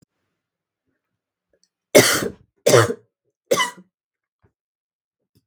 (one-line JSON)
{"three_cough_length": "5.5 s", "three_cough_amplitude": 32768, "three_cough_signal_mean_std_ratio": 0.26, "survey_phase": "beta (2021-08-13 to 2022-03-07)", "age": "45-64", "gender": "Female", "wearing_mask": "No", "symptom_cough_any": true, "symptom_onset": "5 days", "smoker_status": "Never smoked", "respiratory_condition_asthma": false, "respiratory_condition_other": false, "recruitment_source": "Test and Trace", "submission_delay": "1 day", "covid_test_result": "Negative", "covid_test_method": "RT-qPCR"}